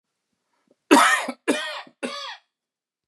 {
  "three_cough_length": "3.1 s",
  "three_cough_amplitude": 30288,
  "three_cough_signal_mean_std_ratio": 0.35,
  "survey_phase": "beta (2021-08-13 to 2022-03-07)",
  "age": "18-44",
  "gender": "Male",
  "wearing_mask": "No",
  "symptom_none": true,
  "smoker_status": "Current smoker (11 or more cigarettes per day)",
  "respiratory_condition_asthma": false,
  "respiratory_condition_other": false,
  "recruitment_source": "REACT",
  "submission_delay": "2 days",
  "covid_test_result": "Negative",
  "covid_test_method": "RT-qPCR",
  "influenza_a_test_result": "Negative",
  "influenza_b_test_result": "Negative"
}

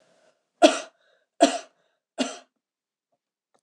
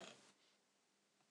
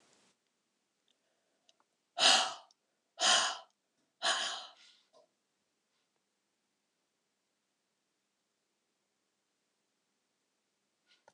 {
  "three_cough_length": "3.6 s",
  "three_cough_amplitude": 25952,
  "three_cough_signal_mean_std_ratio": 0.22,
  "cough_length": "1.3 s",
  "cough_amplitude": 247,
  "cough_signal_mean_std_ratio": 0.49,
  "exhalation_length": "11.3 s",
  "exhalation_amplitude": 9209,
  "exhalation_signal_mean_std_ratio": 0.23,
  "survey_phase": "beta (2021-08-13 to 2022-03-07)",
  "age": "65+",
  "gender": "Female",
  "wearing_mask": "No",
  "symptom_none": true,
  "smoker_status": "Ex-smoker",
  "respiratory_condition_asthma": false,
  "respiratory_condition_other": false,
  "recruitment_source": "REACT",
  "submission_delay": "1 day",
  "covid_test_result": "Negative",
  "covid_test_method": "RT-qPCR"
}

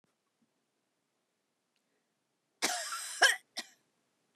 {
  "cough_length": "4.4 s",
  "cough_amplitude": 9161,
  "cough_signal_mean_std_ratio": 0.25,
  "survey_phase": "beta (2021-08-13 to 2022-03-07)",
  "age": "65+",
  "gender": "Female",
  "wearing_mask": "No",
  "symptom_none": true,
  "smoker_status": "Never smoked",
  "respiratory_condition_asthma": false,
  "respiratory_condition_other": false,
  "recruitment_source": "REACT",
  "submission_delay": "0 days",
  "covid_test_result": "Negative",
  "covid_test_method": "RT-qPCR",
  "influenza_a_test_result": "Negative",
  "influenza_b_test_result": "Negative"
}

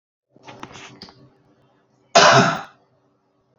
{
  "cough_length": "3.6 s",
  "cough_amplitude": 30139,
  "cough_signal_mean_std_ratio": 0.29,
  "survey_phase": "beta (2021-08-13 to 2022-03-07)",
  "age": "45-64",
  "gender": "Male",
  "wearing_mask": "No",
  "symptom_none": true,
  "smoker_status": "Ex-smoker",
  "respiratory_condition_asthma": false,
  "respiratory_condition_other": false,
  "recruitment_source": "REACT",
  "submission_delay": "3 days",
  "covid_test_result": "Negative",
  "covid_test_method": "RT-qPCR",
  "influenza_a_test_result": "Negative",
  "influenza_b_test_result": "Negative"
}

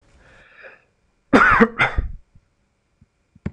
{
  "cough_length": "3.5 s",
  "cough_amplitude": 26028,
  "cough_signal_mean_std_ratio": 0.33,
  "survey_phase": "beta (2021-08-13 to 2022-03-07)",
  "age": "18-44",
  "gender": "Male",
  "wearing_mask": "No",
  "symptom_none": true,
  "symptom_onset": "13 days",
  "smoker_status": "Never smoked",
  "respiratory_condition_asthma": true,
  "respiratory_condition_other": false,
  "recruitment_source": "REACT",
  "submission_delay": "2 days",
  "covid_test_result": "Positive",
  "covid_test_method": "RT-qPCR",
  "covid_ct_value": 36.0,
  "covid_ct_gene": "N gene",
  "influenza_a_test_result": "Negative",
  "influenza_b_test_result": "Negative"
}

